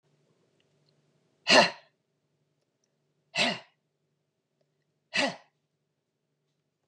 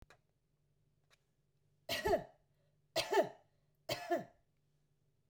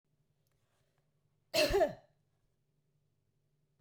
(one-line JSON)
{"exhalation_length": "6.9 s", "exhalation_amplitude": 16156, "exhalation_signal_mean_std_ratio": 0.21, "three_cough_length": "5.3 s", "three_cough_amplitude": 3402, "three_cough_signal_mean_std_ratio": 0.32, "cough_length": "3.8 s", "cough_amplitude": 4557, "cough_signal_mean_std_ratio": 0.26, "survey_phase": "beta (2021-08-13 to 2022-03-07)", "age": "45-64", "gender": "Female", "wearing_mask": "No", "symptom_cough_any": true, "symptom_runny_or_blocked_nose": true, "symptom_sore_throat": true, "symptom_headache": true, "symptom_onset": "5 days", "smoker_status": "Never smoked", "respiratory_condition_asthma": false, "respiratory_condition_other": false, "recruitment_source": "REACT", "submission_delay": "1 day", "covid_test_result": "Negative", "covid_test_method": "RT-qPCR"}